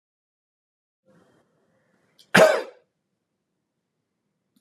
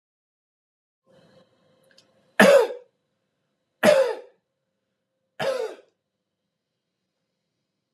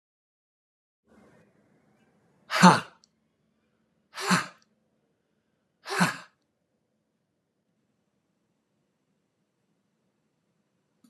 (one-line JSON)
{"cough_length": "4.6 s", "cough_amplitude": 30983, "cough_signal_mean_std_ratio": 0.18, "three_cough_length": "7.9 s", "three_cough_amplitude": 29450, "three_cough_signal_mean_std_ratio": 0.25, "exhalation_length": "11.1 s", "exhalation_amplitude": 29886, "exhalation_signal_mean_std_ratio": 0.17, "survey_phase": "beta (2021-08-13 to 2022-03-07)", "age": "45-64", "gender": "Male", "wearing_mask": "No", "symptom_none": true, "smoker_status": "Ex-smoker", "respiratory_condition_asthma": false, "respiratory_condition_other": false, "recruitment_source": "REACT", "submission_delay": "2 days", "covid_test_result": "Negative", "covid_test_method": "RT-qPCR"}